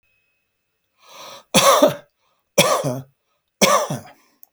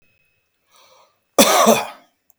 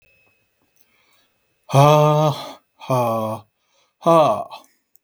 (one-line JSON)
{"three_cough_length": "4.5 s", "three_cough_amplitude": 32768, "three_cough_signal_mean_std_ratio": 0.39, "cough_length": "2.4 s", "cough_amplitude": 32768, "cough_signal_mean_std_ratio": 0.35, "exhalation_length": "5.0 s", "exhalation_amplitude": 32766, "exhalation_signal_mean_std_ratio": 0.44, "survey_phase": "beta (2021-08-13 to 2022-03-07)", "age": "45-64", "gender": "Male", "wearing_mask": "No", "symptom_none": true, "smoker_status": "Ex-smoker", "respiratory_condition_asthma": true, "respiratory_condition_other": false, "recruitment_source": "REACT", "submission_delay": "3 days", "covid_test_result": "Negative", "covid_test_method": "RT-qPCR", "influenza_a_test_result": "Negative", "influenza_b_test_result": "Negative"}